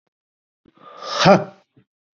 {"exhalation_length": "2.1 s", "exhalation_amplitude": 28955, "exhalation_signal_mean_std_ratio": 0.29, "survey_phase": "beta (2021-08-13 to 2022-03-07)", "age": "18-44", "gender": "Male", "wearing_mask": "No", "symptom_cough_any": true, "symptom_fever_high_temperature": true, "symptom_onset": "11 days", "smoker_status": "Current smoker (1 to 10 cigarettes per day)", "respiratory_condition_asthma": false, "respiratory_condition_other": false, "recruitment_source": "Test and Trace", "submission_delay": "2 days", "covid_test_result": "Positive", "covid_test_method": "RT-qPCR", "covid_ct_value": 23.5, "covid_ct_gene": "N gene"}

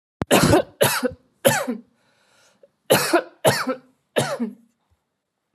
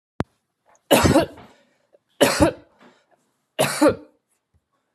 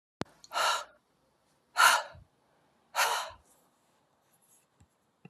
{"cough_length": "5.5 s", "cough_amplitude": 27258, "cough_signal_mean_std_ratio": 0.44, "three_cough_length": "4.9 s", "three_cough_amplitude": 29623, "three_cough_signal_mean_std_ratio": 0.35, "exhalation_length": "5.3 s", "exhalation_amplitude": 12664, "exhalation_signal_mean_std_ratio": 0.3, "survey_phase": "alpha (2021-03-01 to 2021-08-12)", "age": "45-64", "gender": "Female", "wearing_mask": "No", "symptom_none": true, "smoker_status": "Ex-smoker", "respiratory_condition_asthma": false, "respiratory_condition_other": false, "recruitment_source": "REACT", "submission_delay": "1 day", "covid_test_result": "Negative", "covid_test_method": "RT-qPCR"}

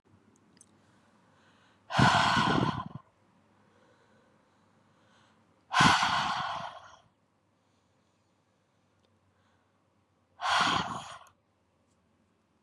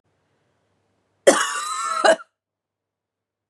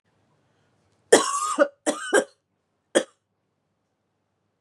{"exhalation_length": "12.6 s", "exhalation_amplitude": 11098, "exhalation_signal_mean_std_ratio": 0.34, "cough_length": "3.5 s", "cough_amplitude": 32098, "cough_signal_mean_std_ratio": 0.32, "three_cough_length": "4.6 s", "three_cough_amplitude": 30818, "three_cough_signal_mean_std_ratio": 0.29, "survey_phase": "beta (2021-08-13 to 2022-03-07)", "age": "18-44", "gender": "Female", "wearing_mask": "No", "symptom_cough_any": true, "symptom_new_continuous_cough": true, "symptom_runny_or_blocked_nose": true, "symptom_sore_throat": true, "symptom_diarrhoea": true, "symptom_fatigue": true, "symptom_headache": true, "symptom_other": true, "smoker_status": "Never smoked", "respiratory_condition_asthma": false, "respiratory_condition_other": false, "recruitment_source": "Test and Trace", "submission_delay": "0 days", "covid_test_result": "Positive", "covid_test_method": "LFT"}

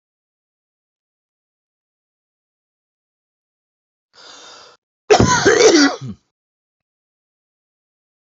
{"cough_length": "8.4 s", "cough_amplitude": 29781, "cough_signal_mean_std_ratio": 0.26, "survey_phase": "alpha (2021-03-01 to 2021-08-12)", "age": "45-64", "gender": "Male", "wearing_mask": "No", "symptom_none": true, "smoker_status": "Never smoked", "respiratory_condition_asthma": false, "respiratory_condition_other": false, "recruitment_source": "REACT", "submission_delay": "2 days", "covid_test_result": "Negative", "covid_test_method": "RT-qPCR"}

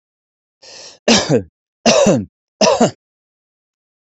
{"three_cough_length": "4.1 s", "three_cough_amplitude": 32271, "three_cough_signal_mean_std_ratio": 0.4, "survey_phase": "beta (2021-08-13 to 2022-03-07)", "age": "45-64", "gender": "Male", "wearing_mask": "No", "symptom_none": true, "smoker_status": "Never smoked", "respiratory_condition_asthma": false, "respiratory_condition_other": false, "recruitment_source": "Test and Trace", "submission_delay": "2 days", "covid_test_result": "Positive", "covid_test_method": "RT-qPCR", "covid_ct_value": 20.9, "covid_ct_gene": "N gene", "covid_ct_mean": 21.7, "covid_viral_load": "77000 copies/ml", "covid_viral_load_category": "Low viral load (10K-1M copies/ml)"}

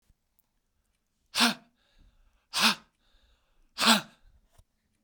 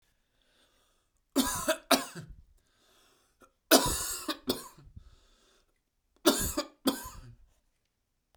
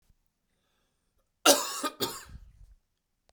{"exhalation_length": "5.0 s", "exhalation_amplitude": 14981, "exhalation_signal_mean_std_ratio": 0.27, "three_cough_length": "8.4 s", "three_cough_amplitude": 21814, "three_cough_signal_mean_std_ratio": 0.32, "cough_length": "3.3 s", "cough_amplitude": 20774, "cough_signal_mean_std_ratio": 0.26, "survey_phase": "beta (2021-08-13 to 2022-03-07)", "age": "18-44", "gender": "Male", "wearing_mask": "No", "symptom_runny_or_blocked_nose": true, "symptom_sore_throat": true, "symptom_fatigue": true, "symptom_headache": true, "symptom_change_to_sense_of_smell_or_taste": true, "smoker_status": "Ex-smoker", "respiratory_condition_asthma": true, "respiratory_condition_other": false, "recruitment_source": "Test and Trace", "submission_delay": "1 day", "covid_test_result": "Positive", "covid_test_method": "RT-qPCR"}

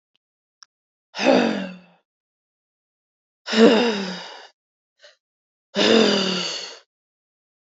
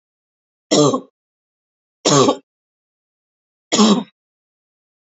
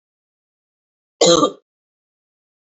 {"exhalation_length": "7.8 s", "exhalation_amplitude": 26156, "exhalation_signal_mean_std_ratio": 0.38, "three_cough_length": "5.0 s", "three_cough_amplitude": 29894, "three_cough_signal_mean_std_ratio": 0.33, "cough_length": "2.7 s", "cough_amplitude": 28944, "cough_signal_mean_std_ratio": 0.26, "survey_phase": "beta (2021-08-13 to 2022-03-07)", "age": "18-44", "gender": "Female", "wearing_mask": "No", "symptom_cough_any": true, "symptom_runny_or_blocked_nose": true, "symptom_fatigue": true, "symptom_change_to_sense_of_smell_or_taste": true, "symptom_onset": "2 days", "smoker_status": "Never smoked", "respiratory_condition_asthma": false, "respiratory_condition_other": false, "recruitment_source": "Test and Trace", "submission_delay": "1 day", "covid_test_result": "Positive", "covid_test_method": "RT-qPCR", "covid_ct_value": 24.5, "covid_ct_gene": "S gene", "covid_ct_mean": 25.0, "covid_viral_load": "6500 copies/ml", "covid_viral_load_category": "Minimal viral load (< 10K copies/ml)"}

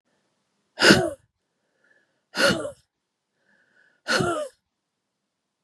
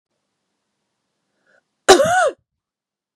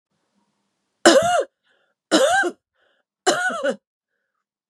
{"exhalation_length": "5.6 s", "exhalation_amplitude": 32673, "exhalation_signal_mean_std_ratio": 0.3, "cough_length": "3.2 s", "cough_amplitude": 32768, "cough_signal_mean_std_ratio": 0.27, "three_cough_length": "4.7 s", "three_cough_amplitude": 32345, "three_cough_signal_mean_std_ratio": 0.4, "survey_phase": "beta (2021-08-13 to 2022-03-07)", "age": "45-64", "gender": "Female", "wearing_mask": "No", "symptom_cough_any": true, "symptom_runny_or_blocked_nose": true, "symptom_sore_throat": true, "symptom_fatigue": true, "symptom_headache": true, "symptom_onset": "2 days", "smoker_status": "Ex-smoker", "respiratory_condition_asthma": false, "respiratory_condition_other": false, "recruitment_source": "Test and Trace", "submission_delay": "1 day", "covid_test_result": "Positive", "covid_test_method": "RT-qPCR", "covid_ct_value": 27.1, "covid_ct_gene": "ORF1ab gene"}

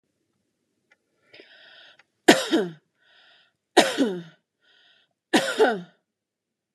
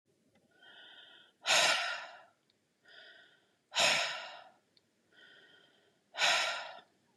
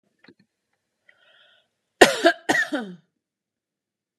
{"three_cough_length": "6.7 s", "three_cough_amplitude": 32468, "three_cough_signal_mean_std_ratio": 0.29, "exhalation_length": "7.2 s", "exhalation_amplitude": 5904, "exhalation_signal_mean_std_ratio": 0.38, "cough_length": "4.2 s", "cough_amplitude": 32768, "cough_signal_mean_std_ratio": 0.24, "survey_phase": "beta (2021-08-13 to 2022-03-07)", "age": "45-64", "gender": "Female", "wearing_mask": "No", "symptom_none": true, "symptom_onset": "6 days", "smoker_status": "Never smoked", "respiratory_condition_asthma": false, "respiratory_condition_other": false, "recruitment_source": "REACT", "submission_delay": "2 days", "covid_test_result": "Negative", "covid_test_method": "RT-qPCR", "influenza_a_test_result": "Unknown/Void", "influenza_b_test_result": "Unknown/Void"}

